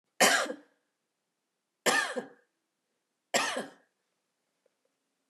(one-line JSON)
{"three_cough_length": "5.3 s", "three_cough_amplitude": 12382, "three_cough_signal_mean_std_ratio": 0.31, "survey_phase": "beta (2021-08-13 to 2022-03-07)", "age": "65+", "gender": "Female", "wearing_mask": "No", "symptom_none": true, "smoker_status": "Ex-smoker", "respiratory_condition_asthma": false, "respiratory_condition_other": false, "recruitment_source": "REACT", "submission_delay": "2 days", "covid_test_result": "Negative", "covid_test_method": "RT-qPCR", "influenza_a_test_result": "Negative", "influenza_b_test_result": "Negative"}